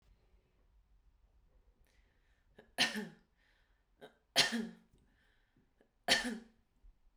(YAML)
three_cough_length: 7.2 s
three_cough_amplitude: 7882
three_cough_signal_mean_std_ratio: 0.27
survey_phase: beta (2021-08-13 to 2022-03-07)
age: 45-64
gender: Female
wearing_mask: 'No'
symptom_runny_or_blocked_nose: true
symptom_fatigue: true
symptom_headache: true
symptom_onset: 3 days
smoker_status: Never smoked
respiratory_condition_asthma: false
respiratory_condition_other: false
recruitment_source: Test and Trace
submission_delay: 2 days
covid_test_result: Negative
covid_test_method: RT-qPCR